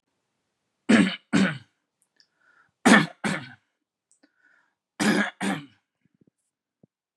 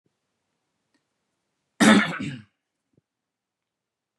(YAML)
three_cough_length: 7.2 s
three_cough_amplitude: 30784
three_cough_signal_mean_std_ratio: 0.31
cough_length: 4.2 s
cough_amplitude: 25677
cough_signal_mean_std_ratio: 0.23
survey_phase: beta (2021-08-13 to 2022-03-07)
age: 18-44
gender: Male
wearing_mask: 'No'
symptom_none: true
smoker_status: Never smoked
respiratory_condition_asthma: false
respiratory_condition_other: false
recruitment_source: REACT
submission_delay: 4 days
covid_test_result: Negative
covid_test_method: RT-qPCR